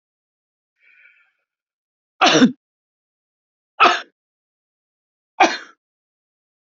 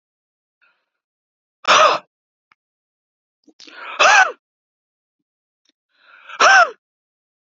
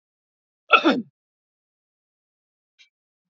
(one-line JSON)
{"three_cough_length": "6.7 s", "three_cough_amplitude": 28331, "three_cough_signal_mean_std_ratio": 0.23, "exhalation_length": "7.6 s", "exhalation_amplitude": 30461, "exhalation_signal_mean_std_ratio": 0.28, "cough_length": "3.3 s", "cough_amplitude": 28602, "cough_signal_mean_std_ratio": 0.2, "survey_phase": "beta (2021-08-13 to 2022-03-07)", "age": "65+", "gender": "Male", "wearing_mask": "No", "symptom_none": true, "smoker_status": "Never smoked", "respiratory_condition_asthma": true, "respiratory_condition_other": false, "recruitment_source": "REACT", "submission_delay": "2 days", "covid_test_result": "Negative", "covid_test_method": "RT-qPCR", "influenza_a_test_result": "Negative", "influenza_b_test_result": "Negative"}